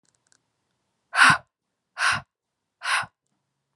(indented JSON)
{
  "exhalation_length": "3.8 s",
  "exhalation_amplitude": 26657,
  "exhalation_signal_mean_std_ratio": 0.29,
  "survey_phase": "alpha (2021-03-01 to 2021-08-12)",
  "age": "18-44",
  "gender": "Female",
  "wearing_mask": "No",
  "symptom_cough_any": true,
  "symptom_new_continuous_cough": true,
  "symptom_abdominal_pain": true,
  "symptom_diarrhoea": true,
  "symptom_fatigue": true,
  "symptom_headache": true,
  "symptom_change_to_sense_of_smell_or_taste": true,
  "symptom_onset": "3 days",
  "smoker_status": "Never smoked",
  "respiratory_condition_asthma": false,
  "respiratory_condition_other": false,
  "recruitment_source": "Test and Trace",
  "submission_delay": "2 days",
  "covid_test_result": "Positive",
  "covid_test_method": "RT-qPCR",
  "covid_ct_value": 13.7,
  "covid_ct_gene": "ORF1ab gene",
  "covid_ct_mean": 14.0,
  "covid_viral_load": "25000000 copies/ml",
  "covid_viral_load_category": "High viral load (>1M copies/ml)"
}